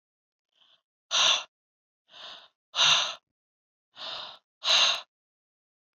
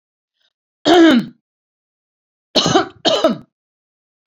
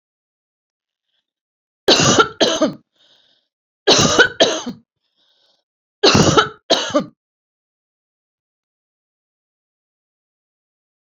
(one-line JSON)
{"exhalation_length": "6.0 s", "exhalation_amplitude": 11595, "exhalation_signal_mean_std_ratio": 0.35, "cough_length": "4.3 s", "cough_amplitude": 30598, "cough_signal_mean_std_ratio": 0.39, "three_cough_length": "11.2 s", "three_cough_amplitude": 32767, "three_cough_signal_mean_std_ratio": 0.33, "survey_phase": "beta (2021-08-13 to 2022-03-07)", "age": "45-64", "gender": "Female", "wearing_mask": "No", "symptom_none": true, "smoker_status": "Never smoked", "respiratory_condition_asthma": false, "respiratory_condition_other": false, "recruitment_source": "REACT", "submission_delay": "1 day", "covid_test_result": "Negative", "covid_test_method": "RT-qPCR"}